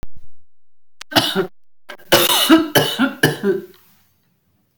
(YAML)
cough_length: 4.8 s
cough_amplitude: 32768
cough_signal_mean_std_ratio: 0.54
survey_phase: beta (2021-08-13 to 2022-03-07)
age: 45-64
gender: Female
wearing_mask: 'No'
symptom_none: true
smoker_status: Ex-smoker
respiratory_condition_asthma: true
respiratory_condition_other: false
recruitment_source: REACT
submission_delay: 4 days
covid_test_result: Negative
covid_test_method: RT-qPCR
influenza_a_test_result: Negative
influenza_b_test_result: Negative